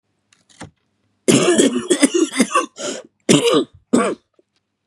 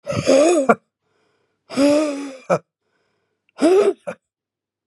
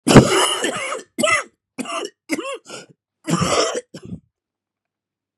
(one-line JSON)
{"three_cough_length": "4.9 s", "three_cough_amplitude": 32768, "three_cough_signal_mean_std_ratio": 0.5, "exhalation_length": "4.9 s", "exhalation_amplitude": 31604, "exhalation_signal_mean_std_ratio": 0.47, "cough_length": "5.4 s", "cough_amplitude": 32768, "cough_signal_mean_std_ratio": 0.43, "survey_phase": "beta (2021-08-13 to 2022-03-07)", "age": "45-64", "gender": "Male", "wearing_mask": "No", "symptom_cough_any": true, "symptom_runny_or_blocked_nose": true, "symptom_sore_throat": true, "symptom_headache": true, "symptom_change_to_sense_of_smell_or_taste": true, "symptom_onset": "3 days", "smoker_status": "Never smoked", "respiratory_condition_asthma": false, "respiratory_condition_other": false, "recruitment_source": "Test and Trace", "submission_delay": "1 day", "covid_test_result": "Positive", "covid_test_method": "RT-qPCR", "covid_ct_value": 18.3, "covid_ct_gene": "ORF1ab gene", "covid_ct_mean": 18.6, "covid_viral_load": "780000 copies/ml", "covid_viral_load_category": "Low viral load (10K-1M copies/ml)"}